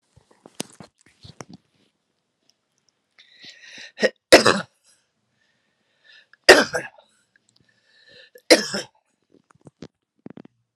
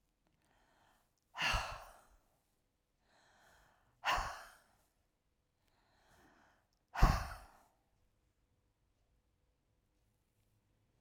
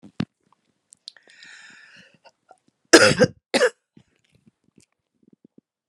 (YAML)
three_cough_length: 10.8 s
three_cough_amplitude: 32768
three_cough_signal_mean_std_ratio: 0.19
exhalation_length: 11.0 s
exhalation_amplitude: 6310
exhalation_signal_mean_std_ratio: 0.22
cough_length: 5.9 s
cough_amplitude: 32768
cough_signal_mean_std_ratio: 0.22
survey_phase: alpha (2021-03-01 to 2021-08-12)
age: 65+
gender: Female
wearing_mask: 'No'
symptom_cough_any: true
symptom_shortness_of_breath: true
symptom_fatigue: true
symptom_headache: true
symptom_change_to_sense_of_smell_or_taste: true
symptom_loss_of_taste: true
smoker_status: Current smoker (11 or more cigarettes per day)
respiratory_condition_asthma: true
respiratory_condition_other: false
recruitment_source: REACT
submission_delay: 2 days
covid_test_result: Negative
covid_test_method: RT-qPCR